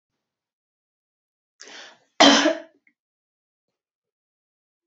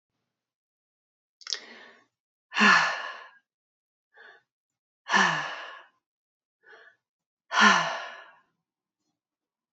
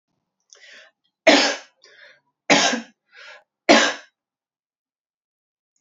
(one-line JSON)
{"cough_length": "4.9 s", "cough_amplitude": 29422, "cough_signal_mean_std_ratio": 0.21, "exhalation_length": "9.7 s", "exhalation_amplitude": 20786, "exhalation_signal_mean_std_ratio": 0.29, "three_cough_length": "5.8 s", "three_cough_amplitude": 28211, "three_cough_signal_mean_std_ratio": 0.29, "survey_phase": "alpha (2021-03-01 to 2021-08-12)", "age": "45-64", "gender": "Female", "wearing_mask": "No", "symptom_none": true, "smoker_status": "Never smoked", "respiratory_condition_asthma": false, "respiratory_condition_other": false, "recruitment_source": "REACT", "submission_delay": "1 day", "covid_test_result": "Negative", "covid_test_method": "RT-qPCR"}